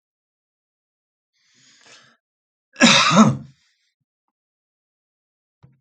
{
  "cough_length": "5.8 s",
  "cough_amplitude": 28781,
  "cough_signal_mean_std_ratio": 0.25,
  "survey_phase": "alpha (2021-03-01 to 2021-08-12)",
  "age": "65+",
  "gender": "Male",
  "wearing_mask": "No",
  "symptom_cough_any": true,
  "symptom_fatigue": true,
  "symptom_onset": "3 days",
  "smoker_status": "Ex-smoker",
  "respiratory_condition_asthma": false,
  "respiratory_condition_other": false,
  "recruitment_source": "Test and Trace",
  "submission_delay": "1 day",
  "covid_test_result": "Positive",
  "covid_test_method": "RT-qPCR",
  "covid_ct_value": 21.4,
  "covid_ct_gene": "ORF1ab gene",
  "covid_ct_mean": 22.1,
  "covid_viral_load": "55000 copies/ml",
  "covid_viral_load_category": "Low viral load (10K-1M copies/ml)"
}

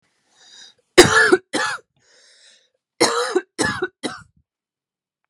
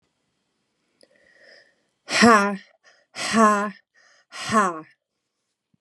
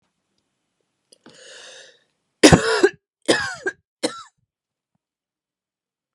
{
  "cough_length": "5.3 s",
  "cough_amplitude": 32768,
  "cough_signal_mean_std_ratio": 0.34,
  "exhalation_length": "5.8 s",
  "exhalation_amplitude": 30968,
  "exhalation_signal_mean_std_ratio": 0.34,
  "three_cough_length": "6.1 s",
  "three_cough_amplitude": 32768,
  "three_cough_signal_mean_std_ratio": 0.24,
  "survey_phase": "beta (2021-08-13 to 2022-03-07)",
  "age": "18-44",
  "gender": "Female",
  "wearing_mask": "No",
  "symptom_cough_any": true,
  "symptom_fatigue": true,
  "symptom_headache": true,
  "symptom_onset": "8 days",
  "smoker_status": "Ex-smoker",
  "respiratory_condition_asthma": false,
  "respiratory_condition_other": false,
  "recruitment_source": "REACT",
  "submission_delay": "1 day",
  "covid_test_result": "Negative",
  "covid_test_method": "RT-qPCR"
}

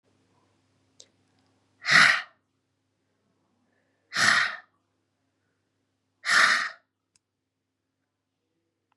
{
  "exhalation_length": "9.0 s",
  "exhalation_amplitude": 21911,
  "exhalation_signal_mean_std_ratio": 0.27,
  "survey_phase": "beta (2021-08-13 to 2022-03-07)",
  "age": "45-64",
  "gender": "Female",
  "wearing_mask": "No",
  "symptom_cough_any": true,
  "symptom_runny_or_blocked_nose": true,
  "symptom_shortness_of_breath": true,
  "symptom_fatigue": true,
  "symptom_headache": true,
  "symptom_change_to_sense_of_smell_or_taste": true,
  "symptom_loss_of_taste": true,
  "smoker_status": "Never smoked",
  "respiratory_condition_asthma": false,
  "respiratory_condition_other": false,
  "recruitment_source": "Test and Trace",
  "submission_delay": "2 days",
  "covid_test_result": "Positive",
  "covid_test_method": "LFT"
}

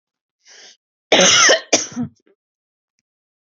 {
  "cough_length": "3.4 s",
  "cough_amplitude": 32768,
  "cough_signal_mean_std_ratio": 0.36,
  "survey_phase": "beta (2021-08-13 to 2022-03-07)",
  "age": "18-44",
  "gender": "Female",
  "wearing_mask": "No",
  "symptom_cough_any": true,
  "symptom_onset": "11 days",
  "smoker_status": "Never smoked",
  "respiratory_condition_asthma": false,
  "respiratory_condition_other": false,
  "recruitment_source": "REACT",
  "submission_delay": "3 days",
  "covid_test_result": "Negative",
  "covid_test_method": "RT-qPCR",
  "influenza_a_test_result": "Negative",
  "influenza_b_test_result": "Negative"
}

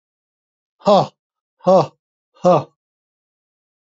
{
  "exhalation_length": "3.8 s",
  "exhalation_amplitude": 28479,
  "exhalation_signal_mean_std_ratio": 0.3,
  "survey_phase": "beta (2021-08-13 to 2022-03-07)",
  "age": "65+",
  "gender": "Male",
  "wearing_mask": "No",
  "symptom_none": true,
  "smoker_status": "Never smoked",
  "respiratory_condition_asthma": false,
  "respiratory_condition_other": false,
  "recruitment_source": "REACT",
  "submission_delay": "2 days",
  "covid_test_result": "Negative",
  "covid_test_method": "RT-qPCR",
  "influenza_a_test_result": "Negative",
  "influenza_b_test_result": "Negative"
}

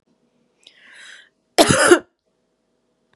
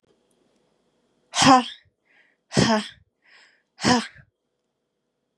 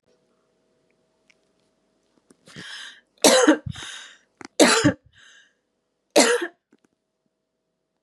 {
  "cough_length": "3.2 s",
  "cough_amplitude": 32768,
  "cough_signal_mean_std_ratio": 0.27,
  "exhalation_length": "5.4 s",
  "exhalation_amplitude": 27729,
  "exhalation_signal_mean_std_ratio": 0.29,
  "three_cough_length": "8.0 s",
  "three_cough_amplitude": 32767,
  "three_cough_signal_mean_std_ratio": 0.29,
  "survey_phase": "beta (2021-08-13 to 2022-03-07)",
  "age": "18-44",
  "gender": "Female",
  "wearing_mask": "No",
  "symptom_cough_any": true,
  "symptom_new_continuous_cough": true,
  "symptom_shortness_of_breath": true,
  "symptom_sore_throat": true,
  "symptom_fatigue": true,
  "symptom_onset": "1 day",
  "smoker_status": "Ex-smoker",
  "respiratory_condition_asthma": false,
  "respiratory_condition_other": false,
  "recruitment_source": "Test and Trace",
  "submission_delay": "0 days",
  "covid_test_result": "Positive",
  "covid_test_method": "RT-qPCR",
  "covid_ct_value": 29.0,
  "covid_ct_gene": "ORF1ab gene",
  "covid_ct_mean": 29.5,
  "covid_viral_load": "210 copies/ml",
  "covid_viral_load_category": "Minimal viral load (< 10K copies/ml)"
}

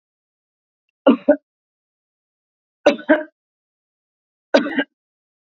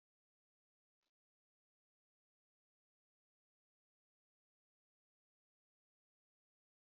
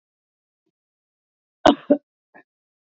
{
  "three_cough_length": "5.5 s",
  "three_cough_amplitude": 28217,
  "three_cough_signal_mean_std_ratio": 0.24,
  "exhalation_length": "7.0 s",
  "exhalation_amplitude": 6,
  "exhalation_signal_mean_std_ratio": 0.04,
  "cough_length": "2.8 s",
  "cough_amplitude": 32188,
  "cough_signal_mean_std_ratio": 0.17,
  "survey_phase": "beta (2021-08-13 to 2022-03-07)",
  "age": "45-64",
  "gender": "Female",
  "wearing_mask": "No",
  "symptom_none": true,
  "smoker_status": "Ex-smoker",
  "respiratory_condition_asthma": false,
  "respiratory_condition_other": false,
  "recruitment_source": "Test and Trace",
  "submission_delay": "1 day",
  "covid_test_result": "Positive",
  "covid_test_method": "RT-qPCR",
  "covid_ct_value": 18.4,
  "covid_ct_gene": "ORF1ab gene"
}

